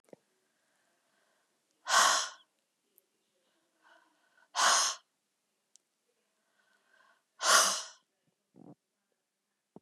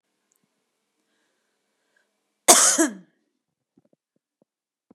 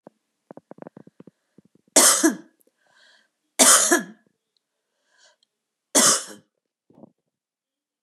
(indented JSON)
{
  "exhalation_length": "9.8 s",
  "exhalation_amplitude": 11773,
  "exhalation_signal_mean_std_ratio": 0.27,
  "cough_length": "4.9 s",
  "cough_amplitude": 32768,
  "cough_signal_mean_std_ratio": 0.21,
  "three_cough_length": "8.0 s",
  "three_cough_amplitude": 31922,
  "three_cough_signal_mean_std_ratio": 0.28,
  "survey_phase": "beta (2021-08-13 to 2022-03-07)",
  "age": "45-64",
  "gender": "Female",
  "wearing_mask": "No",
  "symptom_none": true,
  "smoker_status": "Ex-smoker",
  "respiratory_condition_asthma": false,
  "respiratory_condition_other": false,
  "recruitment_source": "REACT",
  "submission_delay": "1 day",
  "covid_test_result": "Negative",
  "covid_test_method": "RT-qPCR",
  "influenza_a_test_result": "Negative",
  "influenza_b_test_result": "Negative"
}